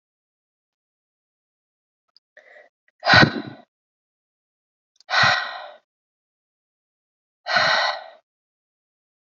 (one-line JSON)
{"exhalation_length": "9.2 s", "exhalation_amplitude": 29001, "exhalation_signal_mean_std_ratio": 0.27, "survey_phase": "alpha (2021-03-01 to 2021-08-12)", "age": "18-44", "gender": "Female", "wearing_mask": "No", "symptom_none": true, "symptom_onset": "3 days", "smoker_status": "Never smoked", "respiratory_condition_asthma": false, "respiratory_condition_other": false, "recruitment_source": "REACT", "submission_delay": "2 days", "covid_test_result": "Negative", "covid_test_method": "RT-qPCR"}